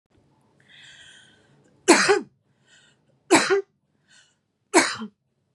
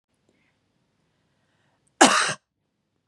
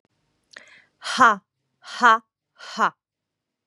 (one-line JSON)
{"three_cough_length": "5.5 s", "three_cough_amplitude": 29161, "three_cough_signal_mean_std_ratio": 0.3, "cough_length": "3.1 s", "cough_amplitude": 31396, "cough_signal_mean_std_ratio": 0.23, "exhalation_length": "3.7 s", "exhalation_amplitude": 26049, "exhalation_signal_mean_std_ratio": 0.28, "survey_phase": "beta (2021-08-13 to 2022-03-07)", "age": "18-44", "gender": "Female", "wearing_mask": "No", "symptom_none": true, "smoker_status": "Never smoked", "respiratory_condition_asthma": false, "respiratory_condition_other": false, "recruitment_source": "REACT", "submission_delay": "2 days", "covid_test_result": "Negative", "covid_test_method": "RT-qPCR", "influenza_a_test_result": "Unknown/Void", "influenza_b_test_result": "Unknown/Void"}